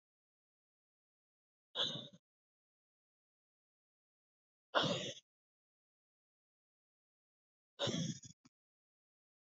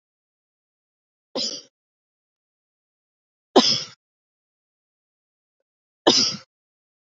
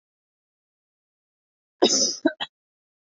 {"exhalation_length": "9.5 s", "exhalation_amplitude": 4637, "exhalation_signal_mean_std_ratio": 0.25, "three_cough_length": "7.2 s", "three_cough_amplitude": 28482, "three_cough_signal_mean_std_ratio": 0.22, "cough_length": "3.1 s", "cough_amplitude": 21530, "cough_signal_mean_std_ratio": 0.27, "survey_phase": "beta (2021-08-13 to 2022-03-07)", "age": "18-44", "gender": "Female", "wearing_mask": "No", "symptom_runny_or_blocked_nose": true, "symptom_fatigue": true, "symptom_headache": true, "symptom_change_to_sense_of_smell_or_taste": true, "symptom_loss_of_taste": true, "symptom_onset": "7 days", "smoker_status": "Never smoked", "respiratory_condition_asthma": false, "respiratory_condition_other": false, "recruitment_source": "Test and Trace", "submission_delay": "2 days", "covid_test_result": "Positive", "covid_test_method": "RT-qPCR", "covid_ct_value": 17.0, "covid_ct_gene": "ORF1ab gene", "covid_ct_mean": 17.5, "covid_viral_load": "1900000 copies/ml", "covid_viral_load_category": "High viral load (>1M copies/ml)"}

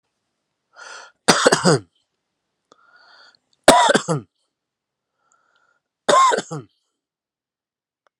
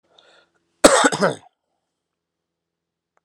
{"three_cough_length": "8.2 s", "three_cough_amplitude": 32768, "three_cough_signal_mean_std_ratio": 0.3, "cough_length": "3.2 s", "cough_amplitude": 32768, "cough_signal_mean_std_ratio": 0.25, "survey_phase": "alpha (2021-03-01 to 2021-08-12)", "age": "45-64", "gender": "Male", "wearing_mask": "No", "symptom_none": true, "smoker_status": "Never smoked", "respiratory_condition_asthma": true, "respiratory_condition_other": false, "recruitment_source": "REACT", "submission_delay": "5 days", "covid_test_result": "Negative", "covid_test_method": "RT-qPCR"}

